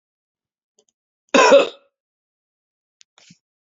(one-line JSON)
{"cough_length": "3.7 s", "cough_amplitude": 28867, "cough_signal_mean_std_ratio": 0.24, "survey_phase": "beta (2021-08-13 to 2022-03-07)", "age": "45-64", "gender": "Male", "wearing_mask": "Yes", "symptom_none": true, "smoker_status": "Never smoked", "respiratory_condition_asthma": false, "respiratory_condition_other": false, "recruitment_source": "Test and Trace", "submission_delay": "1 day", "covid_test_result": "Positive", "covid_test_method": "RT-qPCR"}